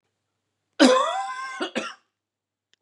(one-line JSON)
{"cough_length": "2.8 s", "cough_amplitude": 26358, "cough_signal_mean_std_ratio": 0.38, "survey_phase": "beta (2021-08-13 to 2022-03-07)", "age": "45-64", "gender": "Male", "wearing_mask": "No", "symptom_none": true, "smoker_status": "Ex-smoker", "respiratory_condition_asthma": false, "respiratory_condition_other": false, "recruitment_source": "REACT", "submission_delay": "1 day", "covid_test_result": "Negative", "covid_test_method": "RT-qPCR", "influenza_a_test_result": "Negative", "influenza_b_test_result": "Negative"}